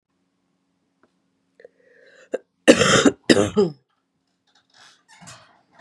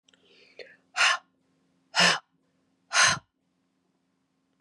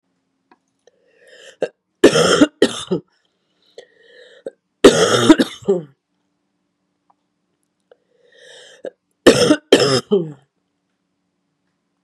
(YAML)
cough_length: 5.8 s
cough_amplitude: 32768
cough_signal_mean_std_ratio: 0.27
exhalation_length: 4.6 s
exhalation_amplitude: 14395
exhalation_signal_mean_std_ratio: 0.31
three_cough_length: 12.0 s
three_cough_amplitude: 32768
three_cough_signal_mean_std_ratio: 0.31
survey_phase: beta (2021-08-13 to 2022-03-07)
age: 45-64
gender: Female
wearing_mask: 'No'
symptom_cough_any: true
symptom_runny_or_blocked_nose: true
symptom_sore_throat: true
symptom_fatigue: true
symptom_change_to_sense_of_smell_or_taste: true
symptom_onset: 10 days
smoker_status: Never smoked
respiratory_condition_asthma: false
respiratory_condition_other: false
recruitment_source: Test and Trace
submission_delay: 1 day
covid_test_result: Positive
covid_test_method: RT-qPCR
covid_ct_value: 20.6
covid_ct_gene: ORF1ab gene
covid_ct_mean: 21.1
covid_viral_load: 120000 copies/ml
covid_viral_load_category: Low viral load (10K-1M copies/ml)